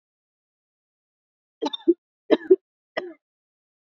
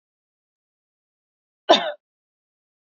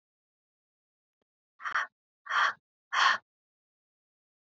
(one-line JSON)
{"three_cough_length": "3.8 s", "three_cough_amplitude": 25923, "three_cough_signal_mean_std_ratio": 0.2, "cough_length": "2.8 s", "cough_amplitude": 28497, "cough_signal_mean_std_ratio": 0.17, "exhalation_length": "4.4 s", "exhalation_amplitude": 9393, "exhalation_signal_mean_std_ratio": 0.29, "survey_phase": "beta (2021-08-13 to 2022-03-07)", "age": "18-44", "gender": "Female", "wearing_mask": "No", "symptom_none": true, "symptom_onset": "13 days", "smoker_status": "Ex-smoker", "respiratory_condition_asthma": false, "respiratory_condition_other": false, "recruitment_source": "REACT", "submission_delay": "2 days", "covid_test_result": "Negative", "covid_test_method": "RT-qPCR", "influenza_a_test_result": "Negative", "influenza_b_test_result": "Negative"}